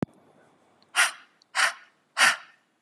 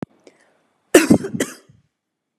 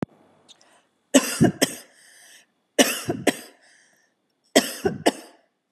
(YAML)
exhalation_length: 2.8 s
exhalation_amplitude: 16595
exhalation_signal_mean_std_ratio: 0.34
cough_length: 2.4 s
cough_amplitude: 32768
cough_signal_mean_std_ratio: 0.27
three_cough_length: 5.7 s
three_cough_amplitude: 29410
three_cough_signal_mean_std_ratio: 0.31
survey_phase: beta (2021-08-13 to 2022-03-07)
age: 45-64
gender: Female
wearing_mask: 'No'
symptom_none: true
smoker_status: Ex-smoker
respiratory_condition_asthma: false
respiratory_condition_other: false
recruitment_source: REACT
submission_delay: 3 days
covid_test_result: Negative
covid_test_method: RT-qPCR
influenza_a_test_result: Negative
influenza_b_test_result: Negative